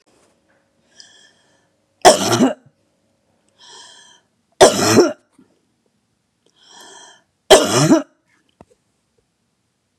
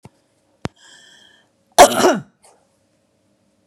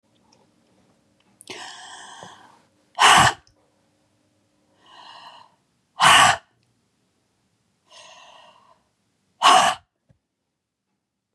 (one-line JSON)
{"three_cough_length": "10.0 s", "three_cough_amplitude": 32768, "three_cough_signal_mean_std_ratio": 0.29, "cough_length": "3.7 s", "cough_amplitude": 32768, "cough_signal_mean_std_ratio": 0.23, "exhalation_length": "11.3 s", "exhalation_amplitude": 29839, "exhalation_signal_mean_std_ratio": 0.26, "survey_phase": "beta (2021-08-13 to 2022-03-07)", "age": "65+", "gender": "Female", "wearing_mask": "No", "symptom_none": true, "smoker_status": "Never smoked", "respiratory_condition_asthma": true, "respiratory_condition_other": false, "recruitment_source": "REACT", "submission_delay": "2 days", "covid_test_result": "Negative", "covid_test_method": "RT-qPCR", "influenza_a_test_result": "Negative", "influenza_b_test_result": "Negative"}